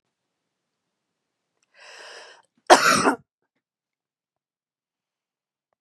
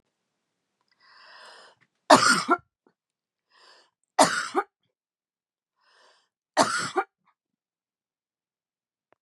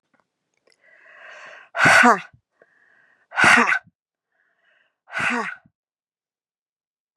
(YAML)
cough_length: 5.8 s
cough_amplitude: 32768
cough_signal_mean_std_ratio: 0.2
three_cough_length: 9.2 s
three_cough_amplitude: 29977
three_cough_signal_mean_std_ratio: 0.24
exhalation_length: 7.2 s
exhalation_amplitude: 31285
exhalation_signal_mean_std_ratio: 0.31
survey_phase: beta (2021-08-13 to 2022-03-07)
age: 18-44
gender: Female
wearing_mask: 'No'
symptom_none: true
symptom_onset: 13 days
smoker_status: Ex-smoker
respiratory_condition_asthma: false
respiratory_condition_other: false
recruitment_source: REACT
submission_delay: 1 day
covid_test_result: Negative
covid_test_method: RT-qPCR
influenza_a_test_result: Negative
influenza_b_test_result: Negative